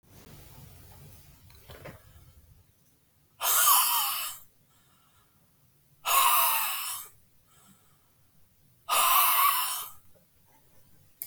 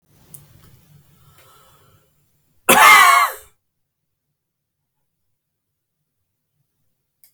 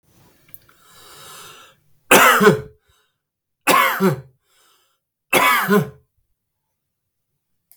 {"exhalation_length": "11.3 s", "exhalation_amplitude": 12696, "exhalation_signal_mean_std_ratio": 0.43, "cough_length": "7.3 s", "cough_amplitude": 32768, "cough_signal_mean_std_ratio": 0.24, "three_cough_length": "7.8 s", "three_cough_amplitude": 32768, "three_cough_signal_mean_std_ratio": 0.36, "survey_phase": "beta (2021-08-13 to 2022-03-07)", "age": "65+", "gender": "Male", "wearing_mask": "No", "symptom_none": true, "smoker_status": "Never smoked", "respiratory_condition_asthma": false, "respiratory_condition_other": false, "recruitment_source": "REACT", "submission_delay": "2 days", "covid_test_result": "Negative", "covid_test_method": "RT-qPCR", "influenza_a_test_result": "Negative", "influenza_b_test_result": "Negative"}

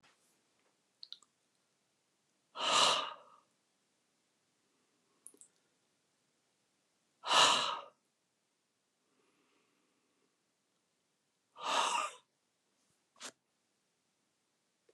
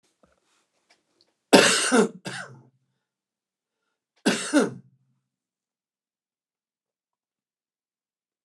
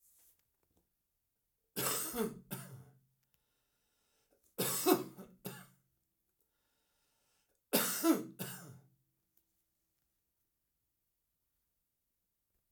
{"exhalation_length": "14.9 s", "exhalation_amplitude": 6688, "exhalation_signal_mean_std_ratio": 0.25, "cough_length": "8.4 s", "cough_amplitude": 29430, "cough_signal_mean_std_ratio": 0.25, "three_cough_length": "12.7 s", "three_cough_amplitude": 6837, "three_cough_signal_mean_std_ratio": 0.29, "survey_phase": "alpha (2021-03-01 to 2021-08-12)", "age": "65+", "gender": "Male", "wearing_mask": "No", "symptom_none": true, "symptom_onset": "12 days", "smoker_status": "Ex-smoker", "respiratory_condition_asthma": false, "respiratory_condition_other": false, "recruitment_source": "REACT", "submission_delay": "2 days", "covid_test_result": "Negative", "covid_test_method": "RT-qPCR"}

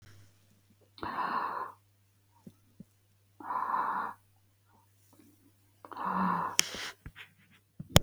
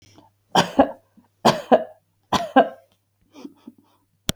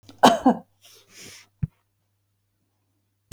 {"exhalation_length": "8.0 s", "exhalation_amplitude": 32768, "exhalation_signal_mean_std_ratio": 0.37, "three_cough_length": "4.4 s", "three_cough_amplitude": 32768, "three_cough_signal_mean_std_ratio": 0.3, "cough_length": "3.3 s", "cough_amplitude": 32768, "cough_signal_mean_std_ratio": 0.23, "survey_phase": "beta (2021-08-13 to 2022-03-07)", "age": "65+", "gender": "Female", "wearing_mask": "No", "symptom_none": true, "smoker_status": "Never smoked", "respiratory_condition_asthma": false, "respiratory_condition_other": false, "recruitment_source": "REACT", "submission_delay": "2 days", "covid_test_result": "Negative", "covid_test_method": "RT-qPCR", "influenza_a_test_result": "Negative", "influenza_b_test_result": "Negative"}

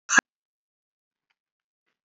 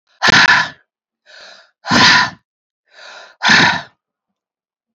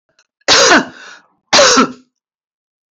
{"cough_length": "2.0 s", "cough_amplitude": 19970, "cough_signal_mean_std_ratio": 0.15, "exhalation_length": "4.9 s", "exhalation_amplitude": 32768, "exhalation_signal_mean_std_ratio": 0.42, "three_cough_length": "2.9 s", "three_cough_amplitude": 31967, "three_cough_signal_mean_std_ratio": 0.45, "survey_phase": "beta (2021-08-13 to 2022-03-07)", "age": "45-64", "gender": "Female", "wearing_mask": "No", "symptom_none": true, "smoker_status": "Never smoked", "respiratory_condition_asthma": false, "respiratory_condition_other": false, "recruitment_source": "Test and Trace", "submission_delay": "2 days", "covid_test_result": "Negative", "covid_test_method": "ePCR"}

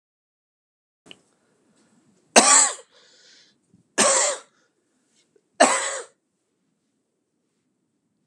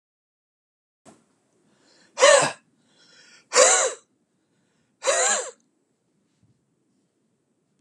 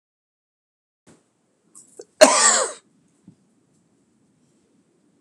{"three_cough_length": "8.3 s", "three_cough_amplitude": 32768, "three_cough_signal_mean_std_ratio": 0.27, "exhalation_length": "7.8 s", "exhalation_amplitude": 29425, "exhalation_signal_mean_std_ratio": 0.28, "cough_length": "5.2 s", "cough_amplitude": 32768, "cough_signal_mean_std_ratio": 0.22, "survey_phase": "beta (2021-08-13 to 2022-03-07)", "age": "45-64", "gender": "Male", "wearing_mask": "No", "symptom_cough_any": true, "symptom_runny_or_blocked_nose": true, "symptom_shortness_of_breath": true, "symptom_fever_high_temperature": true, "symptom_headache": true, "symptom_change_to_sense_of_smell_or_taste": true, "symptom_onset": "2 days", "smoker_status": "Ex-smoker", "respiratory_condition_asthma": false, "respiratory_condition_other": false, "recruitment_source": "Test and Trace", "submission_delay": "1 day", "covid_test_result": "Positive", "covid_test_method": "RT-qPCR", "covid_ct_value": 12.9, "covid_ct_gene": "ORF1ab gene", "covid_ct_mean": 13.3, "covid_viral_load": "44000000 copies/ml", "covid_viral_load_category": "High viral load (>1M copies/ml)"}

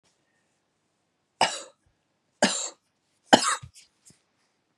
{"three_cough_length": "4.8 s", "three_cough_amplitude": 32083, "three_cough_signal_mean_std_ratio": 0.23, "survey_phase": "beta (2021-08-13 to 2022-03-07)", "age": "45-64", "gender": "Female", "wearing_mask": "No", "symptom_cough_any": true, "symptom_runny_or_blocked_nose": true, "symptom_shortness_of_breath": true, "symptom_fatigue": true, "symptom_fever_high_temperature": true, "symptom_headache": true, "symptom_onset": "4 days", "smoker_status": "Never smoked", "respiratory_condition_asthma": false, "respiratory_condition_other": false, "recruitment_source": "Test and Trace", "submission_delay": "2 days", "covid_test_result": "Positive", "covid_test_method": "ePCR"}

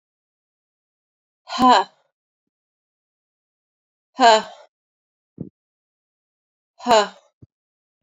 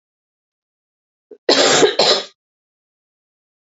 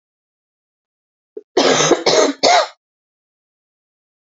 {"exhalation_length": "8.0 s", "exhalation_amplitude": 27247, "exhalation_signal_mean_std_ratio": 0.23, "cough_length": "3.7 s", "cough_amplitude": 31288, "cough_signal_mean_std_ratio": 0.35, "three_cough_length": "4.3 s", "three_cough_amplitude": 31225, "three_cough_signal_mean_std_ratio": 0.38, "survey_phase": "beta (2021-08-13 to 2022-03-07)", "age": "45-64", "gender": "Female", "wearing_mask": "No", "symptom_cough_any": true, "symptom_new_continuous_cough": true, "symptom_runny_or_blocked_nose": true, "symptom_shortness_of_breath": true, "symptom_sore_throat": true, "symptom_fatigue": true, "symptom_headache": true, "symptom_onset": "5 days", "smoker_status": "Never smoked", "respiratory_condition_asthma": false, "respiratory_condition_other": false, "recruitment_source": "Test and Trace", "submission_delay": "2 days", "covid_test_result": "Positive", "covid_test_method": "RT-qPCR", "covid_ct_value": 26.1, "covid_ct_gene": "N gene"}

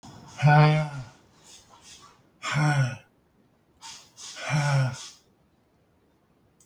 {"exhalation_length": "6.7 s", "exhalation_amplitude": 14049, "exhalation_signal_mean_std_ratio": 0.42, "survey_phase": "beta (2021-08-13 to 2022-03-07)", "age": "65+", "gender": "Male", "wearing_mask": "No", "symptom_none": true, "smoker_status": "Never smoked", "respiratory_condition_asthma": false, "respiratory_condition_other": false, "recruitment_source": "REACT", "submission_delay": "5 days", "covid_test_result": "Negative", "covid_test_method": "RT-qPCR", "influenza_a_test_result": "Negative", "influenza_b_test_result": "Negative"}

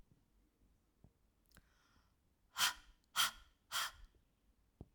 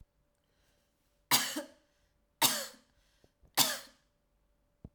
{"exhalation_length": "4.9 s", "exhalation_amplitude": 3013, "exhalation_signal_mean_std_ratio": 0.27, "three_cough_length": "4.9 s", "three_cough_amplitude": 8933, "three_cough_signal_mean_std_ratio": 0.28, "survey_phase": "alpha (2021-03-01 to 2021-08-12)", "age": "18-44", "gender": "Female", "wearing_mask": "No", "symptom_none": true, "smoker_status": "Never smoked", "respiratory_condition_asthma": false, "respiratory_condition_other": false, "recruitment_source": "REACT", "submission_delay": "1 day", "covid_test_result": "Negative", "covid_test_method": "RT-qPCR"}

